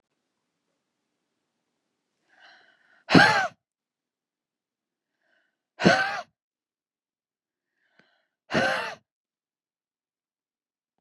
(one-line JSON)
{"exhalation_length": "11.0 s", "exhalation_amplitude": 29559, "exhalation_signal_mean_std_ratio": 0.22, "survey_phase": "beta (2021-08-13 to 2022-03-07)", "age": "45-64", "gender": "Female", "wearing_mask": "No", "symptom_cough_any": true, "symptom_runny_or_blocked_nose": true, "symptom_fatigue": true, "smoker_status": "Ex-smoker", "respiratory_condition_asthma": false, "respiratory_condition_other": false, "recruitment_source": "Test and Trace", "submission_delay": "2 days", "covid_test_result": "Positive", "covid_test_method": "RT-qPCR", "covid_ct_value": 21.0, "covid_ct_gene": "N gene"}